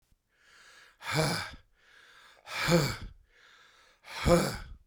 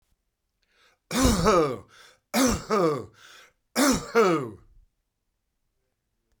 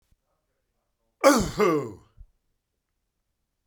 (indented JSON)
{
  "exhalation_length": "4.9 s",
  "exhalation_amplitude": 9509,
  "exhalation_signal_mean_std_ratio": 0.42,
  "three_cough_length": "6.4 s",
  "three_cough_amplitude": 16370,
  "three_cough_signal_mean_std_ratio": 0.46,
  "cough_length": "3.7 s",
  "cough_amplitude": 22455,
  "cough_signal_mean_std_ratio": 0.3,
  "survey_phase": "beta (2021-08-13 to 2022-03-07)",
  "age": "65+",
  "gender": "Male",
  "wearing_mask": "No",
  "symptom_headache": true,
  "smoker_status": "Never smoked",
  "respiratory_condition_asthma": false,
  "respiratory_condition_other": false,
  "recruitment_source": "Test and Trace",
  "submission_delay": "1 day",
  "covid_test_result": "Positive",
  "covid_test_method": "RT-qPCR",
  "covid_ct_value": 28.3,
  "covid_ct_gene": "ORF1ab gene",
  "covid_ct_mean": 31.0,
  "covid_viral_load": "66 copies/ml",
  "covid_viral_load_category": "Minimal viral load (< 10K copies/ml)"
}